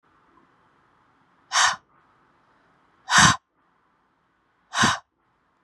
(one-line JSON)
{"exhalation_length": "5.6 s", "exhalation_amplitude": 26445, "exhalation_signal_mean_std_ratio": 0.27, "survey_phase": "beta (2021-08-13 to 2022-03-07)", "age": "18-44", "gender": "Female", "wearing_mask": "No", "symptom_runny_or_blocked_nose": true, "symptom_sore_throat": true, "symptom_abdominal_pain": true, "symptom_fatigue": true, "symptom_headache": true, "symptom_onset": "4 days", "smoker_status": "Never smoked", "respiratory_condition_asthma": true, "respiratory_condition_other": false, "recruitment_source": "REACT", "submission_delay": "2 days", "covid_test_result": "Negative", "covid_test_method": "RT-qPCR", "influenza_a_test_result": "Unknown/Void", "influenza_b_test_result": "Unknown/Void"}